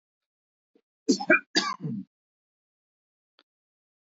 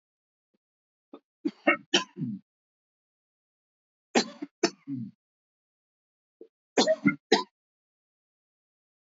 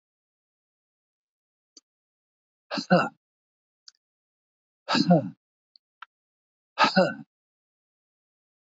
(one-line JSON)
{"cough_length": "4.0 s", "cough_amplitude": 14493, "cough_signal_mean_std_ratio": 0.26, "three_cough_length": "9.1 s", "three_cough_amplitude": 14021, "three_cough_signal_mean_std_ratio": 0.25, "exhalation_length": "8.6 s", "exhalation_amplitude": 14357, "exhalation_signal_mean_std_ratio": 0.24, "survey_phase": "alpha (2021-03-01 to 2021-08-12)", "age": "65+", "gender": "Male", "wearing_mask": "No", "symptom_none": true, "smoker_status": "Never smoked", "respiratory_condition_asthma": false, "respiratory_condition_other": false, "recruitment_source": "REACT", "submission_delay": "1 day", "covid_test_result": "Negative", "covid_test_method": "RT-qPCR"}